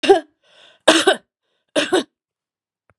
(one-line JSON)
{"three_cough_length": "3.0 s", "three_cough_amplitude": 32768, "three_cough_signal_mean_std_ratio": 0.35, "survey_phase": "beta (2021-08-13 to 2022-03-07)", "age": "65+", "gender": "Female", "wearing_mask": "No", "symptom_cough_any": true, "symptom_sore_throat": true, "smoker_status": "Never smoked", "respiratory_condition_asthma": true, "respiratory_condition_other": false, "recruitment_source": "Test and Trace", "submission_delay": "2 days", "covid_test_result": "Positive", "covid_test_method": "RT-qPCR", "covid_ct_value": 17.2, "covid_ct_gene": "ORF1ab gene", "covid_ct_mean": 17.4, "covid_viral_load": "2000000 copies/ml", "covid_viral_load_category": "High viral load (>1M copies/ml)"}